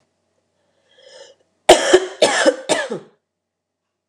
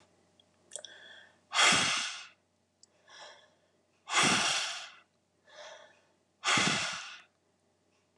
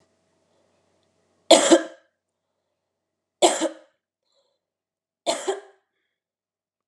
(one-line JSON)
{"cough_length": "4.1 s", "cough_amplitude": 32768, "cough_signal_mean_std_ratio": 0.33, "exhalation_length": "8.2 s", "exhalation_amplitude": 9225, "exhalation_signal_mean_std_ratio": 0.4, "three_cough_length": "6.9 s", "three_cough_amplitude": 31878, "three_cough_signal_mean_std_ratio": 0.23, "survey_phase": "beta (2021-08-13 to 2022-03-07)", "age": "45-64", "gender": "Female", "wearing_mask": "No", "symptom_none": true, "symptom_onset": "13 days", "smoker_status": "Ex-smoker", "respiratory_condition_asthma": false, "respiratory_condition_other": false, "recruitment_source": "REACT", "submission_delay": "2 days", "covid_test_result": "Negative", "covid_test_method": "RT-qPCR", "influenza_a_test_result": "Unknown/Void", "influenza_b_test_result": "Unknown/Void"}